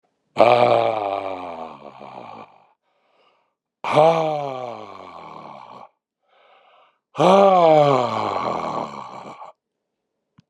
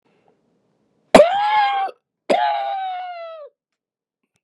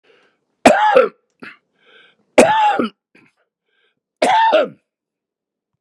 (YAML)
exhalation_length: 10.5 s
exhalation_amplitude: 32091
exhalation_signal_mean_std_ratio: 0.44
cough_length: 4.4 s
cough_amplitude: 32768
cough_signal_mean_std_ratio: 0.44
three_cough_length: 5.8 s
three_cough_amplitude: 32768
three_cough_signal_mean_std_ratio: 0.4
survey_phase: beta (2021-08-13 to 2022-03-07)
age: 65+
gender: Male
wearing_mask: 'No'
symptom_sore_throat: true
symptom_fatigue: true
symptom_fever_high_temperature: true
symptom_onset: 5 days
smoker_status: Ex-smoker
respiratory_condition_asthma: false
respiratory_condition_other: false
recruitment_source: Test and Trace
submission_delay: 1 day
covid_test_result: Positive
covid_test_method: RT-qPCR